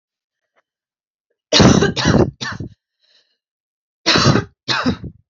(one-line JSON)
{"three_cough_length": "5.3 s", "three_cough_amplitude": 32137, "three_cough_signal_mean_std_ratio": 0.41, "survey_phase": "alpha (2021-03-01 to 2021-08-12)", "age": "18-44", "gender": "Female", "wearing_mask": "No", "symptom_cough_any": true, "symptom_new_continuous_cough": true, "symptom_shortness_of_breath": true, "symptom_fatigue": true, "symptom_headache": true, "symptom_change_to_sense_of_smell_or_taste": true, "symptom_loss_of_taste": true, "symptom_onset": "2 days", "smoker_status": "Ex-smoker", "respiratory_condition_asthma": true, "respiratory_condition_other": false, "recruitment_source": "Test and Trace", "submission_delay": "2 days", "covid_test_result": "Positive", "covid_test_method": "RT-qPCR", "covid_ct_value": 16.2, "covid_ct_gene": "ORF1ab gene", "covid_ct_mean": 16.9, "covid_viral_load": "3000000 copies/ml", "covid_viral_load_category": "High viral load (>1M copies/ml)"}